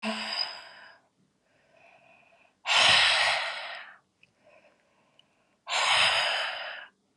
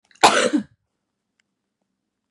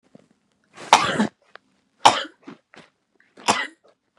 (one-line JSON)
{"exhalation_length": "7.2 s", "exhalation_amplitude": 14083, "exhalation_signal_mean_std_ratio": 0.48, "cough_length": "2.3 s", "cough_amplitude": 32768, "cough_signal_mean_std_ratio": 0.29, "three_cough_length": "4.2 s", "three_cough_amplitude": 32768, "three_cough_signal_mean_std_ratio": 0.27, "survey_phase": "beta (2021-08-13 to 2022-03-07)", "age": "18-44", "gender": "Female", "wearing_mask": "No", "symptom_cough_any": true, "symptom_runny_or_blocked_nose": true, "symptom_sore_throat": true, "symptom_fatigue": true, "smoker_status": "Ex-smoker", "respiratory_condition_asthma": true, "respiratory_condition_other": false, "recruitment_source": "Test and Trace", "submission_delay": "2 days", "covid_test_result": "Positive", "covid_test_method": "RT-qPCR", "covid_ct_value": 21.5, "covid_ct_gene": "N gene"}